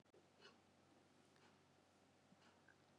{"exhalation_length": "3.0 s", "exhalation_amplitude": 92, "exhalation_signal_mean_std_ratio": 1.04, "survey_phase": "beta (2021-08-13 to 2022-03-07)", "age": "45-64", "gender": "Female", "wearing_mask": "No", "symptom_cough_any": true, "symptom_runny_or_blocked_nose": true, "symptom_sore_throat": true, "symptom_headache": true, "symptom_other": true, "symptom_onset": "4 days", "smoker_status": "Never smoked", "respiratory_condition_asthma": false, "respiratory_condition_other": false, "recruitment_source": "Test and Trace", "submission_delay": "2 days", "covid_test_result": "Positive", "covid_test_method": "RT-qPCR", "covid_ct_value": 27.8, "covid_ct_gene": "ORF1ab gene", "covid_ct_mean": 28.2, "covid_viral_load": "560 copies/ml", "covid_viral_load_category": "Minimal viral load (< 10K copies/ml)"}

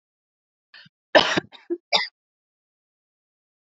{"cough_length": "3.7 s", "cough_amplitude": 26826, "cough_signal_mean_std_ratio": 0.23, "survey_phase": "alpha (2021-03-01 to 2021-08-12)", "age": "18-44", "gender": "Female", "wearing_mask": "No", "symptom_none": true, "smoker_status": "Ex-smoker", "respiratory_condition_asthma": false, "respiratory_condition_other": false, "recruitment_source": "REACT", "submission_delay": "1 day", "covid_test_result": "Negative", "covid_test_method": "RT-qPCR"}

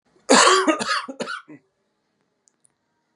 {"cough_length": "3.2 s", "cough_amplitude": 27891, "cough_signal_mean_std_ratio": 0.38, "survey_phase": "beta (2021-08-13 to 2022-03-07)", "age": "45-64", "gender": "Male", "wearing_mask": "No", "symptom_cough_any": true, "symptom_runny_or_blocked_nose": true, "symptom_sore_throat": true, "symptom_onset": "7 days", "smoker_status": "Ex-smoker", "respiratory_condition_asthma": false, "respiratory_condition_other": false, "recruitment_source": "REACT", "submission_delay": "2 days", "covid_test_result": "Negative", "covid_test_method": "RT-qPCR"}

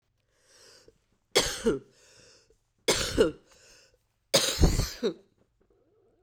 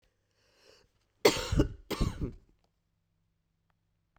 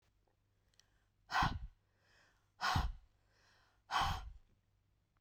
{"three_cough_length": "6.2 s", "three_cough_amplitude": 15224, "three_cough_signal_mean_std_ratio": 0.36, "cough_length": "4.2 s", "cough_amplitude": 13567, "cough_signal_mean_std_ratio": 0.28, "exhalation_length": "5.2 s", "exhalation_amplitude": 3400, "exhalation_signal_mean_std_ratio": 0.36, "survey_phase": "beta (2021-08-13 to 2022-03-07)", "age": "45-64", "gender": "Female", "wearing_mask": "No", "symptom_cough_any": true, "symptom_shortness_of_breath": true, "symptom_fatigue": true, "symptom_headache": true, "symptom_other": true, "symptom_onset": "7 days", "smoker_status": "Current smoker (e-cigarettes or vapes only)", "respiratory_condition_asthma": false, "respiratory_condition_other": false, "recruitment_source": "Test and Trace", "submission_delay": "2 days", "covid_test_result": "Positive", "covid_test_method": "RT-qPCR", "covid_ct_value": 29.1, "covid_ct_gene": "ORF1ab gene", "covid_ct_mean": 29.8, "covid_viral_load": "170 copies/ml", "covid_viral_load_category": "Minimal viral load (< 10K copies/ml)"}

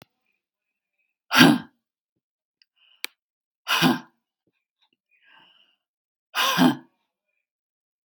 {"exhalation_length": "8.1 s", "exhalation_amplitude": 32767, "exhalation_signal_mean_std_ratio": 0.25, "survey_phase": "beta (2021-08-13 to 2022-03-07)", "age": "45-64", "gender": "Female", "wearing_mask": "No", "symptom_cough_any": true, "symptom_change_to_sense_of_smell_or_taste": true, "symptom_onset": "11 days", "smoker_status": "Ex-smoker", "respiratory_condition_asthma": false, "respiratory_condition_other": false, "recruitment_source": "REACT", "submission_delay": "2 days", "covid_test_result": "Positive", "covid_test_method": "RT-qPCR", "covid_ct_value": 24.0, "covid_ct_gene": "E gene", "influenza_a_test_result": "Negative", "influenza_b_test_result": "Negative"}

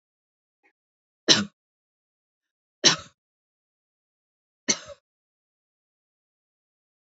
{"three_cough_length": "7.1 s", "three_cough_amplitude": 28110, "three_cough_signal_mean_std_ratio": 0.16, "survey_phase": "beta (2021-08-13 to 2022-03-07)", "age": "45-64", "gender": "Female", "wearing_mask": "No", "symptom_none": true, "smoker_status": "Never smoked", "respiratory_condition_asthma": false, "respiratory_condition_other": false, "recruitment_source": "REACT", "submission_delay": "0 days", "covid_test_result": "Negative", "covid_test_method": "RT-qPCR", "influenza_a_test_result": "Negative", "influenza_b_test_result": "Negative"}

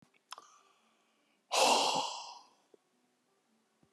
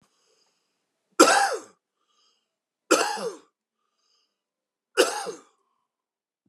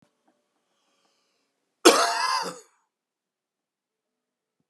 {"exhalation_length": "3.9 s", "exhalation_amplitude": 5826, "exhalation_signal_mean_std_ratio": 0.34, "three_cough_length": "6.5 s", "three_cough_amplitude": 30442, "three_cough_signal_mean_std_ratio": 0.27, "cough_length": "4.7 s", "cough_amplitude": 32725, "cough_signal_mean_std_ratio": 0.24, "survey_phase": "beta (2021-08-13 to 2022-03-07)", "age": "65+", "gender": "Male", "wearing_mask": "No", "symptom_cough_any": true, "symptom_onset": "4 days", "smoker_status": "Ex-smoker", "respiratory_condition_asthma": false, "respiratory_condition_other": true, "recruitment_source": "Test and Trace", "submission_delay": "1 day", "covid_test_result": "Positive", "covid_test_method": "RT-qPCR", "covid_ct_value": 25.0, "covid_ct_gene": "ORF1ab gene"}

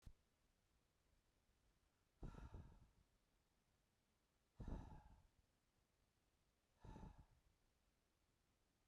{"exhalation_length": "8.9 s", "exhalation_amplitude": 318, "exhalation_signal_mean_std_ratio": 0.38, "survey_phase": "beta (2021-08-13 to 2022-03-07)", "age": "18-44", "gender": "Male", "wearing_mask": "No", "symptom_cough_any": true, "symptom_shortness_of_breath": true, "symptom_diarrhoea": true, "symptom_fatigue": true, "symptom_headache": true, "smoker_status": "Never smoked", "respiratory_condition_asthma": false, "respiratory_condition_other": false, "recruitment_source": "REACT", "submission_delay": "1 day", "covid_test_result": "Negative", "covid_test_method": "RT-qPCR"}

